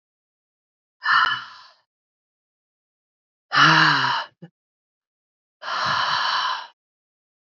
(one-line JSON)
{"exhalation_length": "7.6 s", "exhalation_amplitude": 25557, "exhalation_signal_mean_std_ratio": 0.4, "survey_phase": "alpha (2021-03-01 to 2021-08-12)", "age": "18-44", "gender": "Female", "wearing_mask": "No", "symptom_cough_any": true, "symptom_new_continuous_cough": true, "symptom_shortness_of_breath": true, "symptom_fatigue": true, "symptom_fever_high_temperature": true, "symptom_headache": true, "symptom_change_to_sense_of_smell_or_taste": true, "symptom_loss_of_taste": true, "symptom_onset": "3 days", "smoker_status": "Current smoker (e-cigarettes or vapes only)", "respiratory_condition_asthma": false, "respiratory_condition_other": false, "recruitment_source": "Test and Trace", "submission_delay": "1 day", "covid_test_result": "Positive", "covid_test_method": "RT-qPCR"}